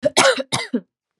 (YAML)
cough_length: 1.2 s
cough_amplitude: 32767
cough_signal_mean_std_ratio: 0.49
survey_phase: beta (2021-08-13 to 2022-03-07)
age: 18-44
gender: Female
wearing_mask: 'No'
symptom_none: true
smoker_status: Never smoked
respiratory_condition_asthma: false
respiratory_condition_other: false
recruitment_source: REACT
submission_delay: 2 days
covid_test_result: Negative
covid_test_method: RT-qPCR